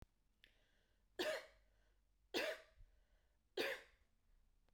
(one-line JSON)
{"three_cough_length": "4.7 s", "three_cough_amplitude": 1359, "three_cough_signal_mean_std_ratio": 0.35, "survey_phase": "beta (2021-08-13 to 2022-03-07)", "age": "45-64", "gender": "Female", "wearing_mask": "No", "symptom_none": true, "smoker_status": "Ex-smoker", "respiratory_condition_asthma": false, "respiratory_condition_other": false, "recruitment_source": "REACT", "submission_delay": "5 days", "covid_test_result": "Negative", "covid_test_method": "RT-qPCR"}